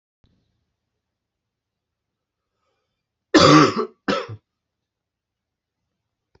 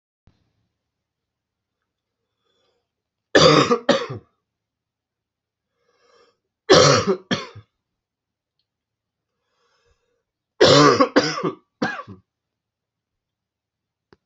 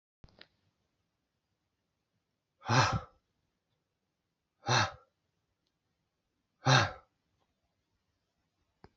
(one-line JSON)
{"cough_length": "6.4 s", "cough_amplitude": 29762, "cough_signal_mean_std_ratio": 0.23, "three_cough_length": "14.3 s", "three_cough_amplitude": 32767, "three_cough_signal_mean_std_ratio": 0.28, "exhalation_length": "9.0 s", "exhalation_amplitude": 8430, "exhalation_signal_mean_std_ratio": 0.23, "survey_phase": "beta (2021-08-13 to 2022-03-07)", "age": "45-64", "gender": "Male", "wearing_mask": "No", "symptom_cough_any": true, "symptom_new_continuous_cough": true, "symptom_runny_or_blocked_nose": true, "symptom_diarrhoea": true, "smoker_status": "Never smoked", "respiratory_condition_asthma": true, "respiratory_condition_other": false, "recruitment_source": "Test and Trace", "submission_delay": "1 day", "covid_test_result": "Positive", "covid_test_method": "LFT"}